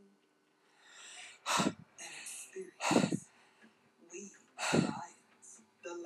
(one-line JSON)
{"exhalation_length": "6.1 s", "exhalation_amplitude": 6347, "exhalation_signal_mean_std_ratio": 0.41, "survey_phase": "beta (2021-08-13 to 2022-03-07)", "age": "45-64", "gender": "Female", "wearing_mask": "No", "symptom_none": true, "smoker_status": "Current smoker (11 or more cigarettes per day)", "respiratory_condition_asthma": false, "respiratory_condition_other": false, "recruitment_source": "REACT", "submission_delay": "2 days", "covid_test_result": "Negative", "covid_test_method": "RT-qPCR", "influenza_a_test_result": "Negative", "influenza_b_test_result": "Negative"}